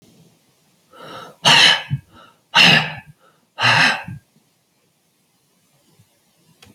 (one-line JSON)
{"exhalation_length": "6.7 s", "exhalation_amplitude": 31527, "exhalation_signal_mean_std_ratio": 0.35, "survey_phase": "alpha (2021-03-01 to 2021-08-12)", "age": "65+", "gender": "Male", "wearing_mask": "No", "symptom_none": true, "symptom_onset": "12 days", "smoker_status": "Never smoked", "respiratory_condition_asthma": false, "respiratory_condition_other": false, "recruitment_source": "REACT", "submission_delay": "1 day", "covid_test_result": "Negative", "covid_test_method": "RT-qPCR"}